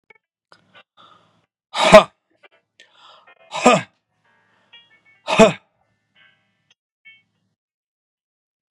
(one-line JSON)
{"exhalation_length": "8.7 s", "exhalation_amplitude": 32768, "exhalation_signal_mean_std_ratio": 0.2, "survey_phase": "beta (2021-08-13 to 2022-03-07)", "age": "45-64", "gender": "Male", "wearing_mask": "No", "symptom_none": true, "smoker_status": "Ex-smoker", "respiratory_condition_asthma": false, "respiratory_condition_other": false, "recruitment_source": "REACT", "submission_delay": "1 day", "covid_test_result": "Negative", "covid_test_method": "RT-qPCR", "influenza_a_test_result": "Negative", "influenza_b_test_result": "Negative"}